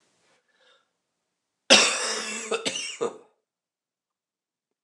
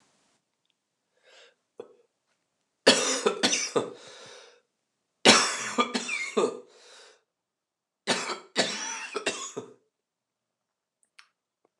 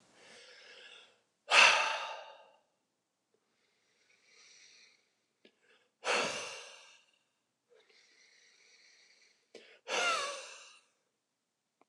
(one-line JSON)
{"cough_length": "4.8 s", "cough_amplitude": 27837, "cough_signal_mean_std_ratio": 0.31, "three_cough_length": "11.8 s", "three_cough_amplitude": 25090, "three_cough_signal_mean_std_ratio": 0.34, "exhalation_length": "11.9 s", "exhalation_amplitude": 10808, "exhalation_signal_mean_std_ratio": 0.27, "survey_phase": "beta (2021-08-13 to 2022-03-07)", "age": "45-64", "gender": "Male", "wearing_mask": "No", "symptom_cough_any": true, "symptom_runny_or_blocked_nose": true, "symptom_fatigue": true, "symptom_headache": true, "smoker_status": "Ex-smoker", "respiratory_condition_asthma": false, "respiratory_condition_other": false, "recruitment_source": "Test and Trace", "submission_delay": "2 days", "covid_test_result": "Positive", "covid_test_method": "RT-qPCR"}